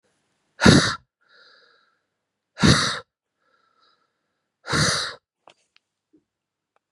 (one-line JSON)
{"exhalation_length": "6.9 s", "exhalation_amplitude": 32767, "exhalation_signal_mean_std_ratio": 0.28, "survey_phase": "beta (2021-08-13 to 2022-03-07)", "age": "45-64", "gender": "Female", "wearing_mask": "No", "symptom_none": true, "symptom_onset": "12 days", "smoker_status": "Ex-smoker", "respiratory_condition_asthma": false, "respiratory_condition_other": false, "recruitment_source": "REACT", "submission_delay": "3 days", "covid_test_result": "Positive", "covid_test_method": "RT-qPCR", "covid_ct_value": 24.8, "covid_ct_gene": "E gene", "influenza_a_test_result": "Negative", "influenza_b_test_result": "Negative"}